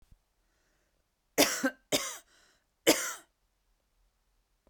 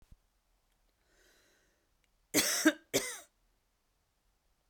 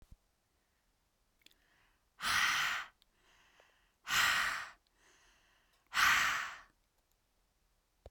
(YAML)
three_cough_length: 4.7 s
three_cough_amplitude: 11339
three_cough_signal_mean_std_ratio: 0.27
cough_length: 4.7 s
cough_amplitude: 8800
cough_signal_mean_std_ratio: 0.25
exhalation_length: 8.1 s
exhalation_amplitude: 4770
exhalation_signal_mean_std_ratio: 0.38
survey_phase: beta (2021-08-13 to 2022-03-07)
age: 45-64
gender: Female
wearing_mask: 'No'
symptom_cough_any: true
symptom_runny_or_blocked_nose: true
symptom_diarrhoea: true
symptom_headache: true
symptom_onset: 4 days
smoker_status: Ex-smoker
respiratory_condition_asthma: false
respiratory_condition_other: false
recruitment_source: Test and Trace
submission_delay: 2 days
covid_test_result: Positive
covid_test_method: RT-qPCR
covid_ct_value: 21.4
covid_ct_gene: ORF1ab gene